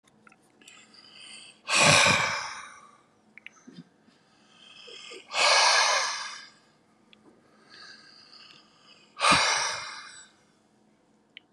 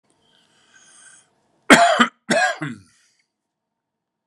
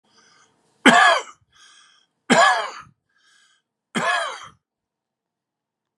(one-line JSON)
{"exhalation_length": "11.5 s", "exhalation_amplitude": 18150, "exhalation_signal_mean_std_ratio": 0.39, "cough_length": "4.3 s", "cough_amplitude": 32768, "cough_signal_mean_std_ratio": 0.3, "three_cough_length": "6.0 s", "three_cough_amplitude": 32768, "three_cough_signal_mean_std_ratio": 0.32, "survey_phase": "beta (2021-08-13 to 2022-03-07)", "age": "65+", "gender": "Male", "wearing_mask": "No", "symptom_cough_any": true, "smoker_status": "Ex-smoker", "respiratory_condition_asthma": false, "respiratory_condition_other": true, "recruitment_source": "Test and Trace", "submission_delay": "1 day", "covid_test_result": "Negative", "covid_test_method": "RT-qPCR"}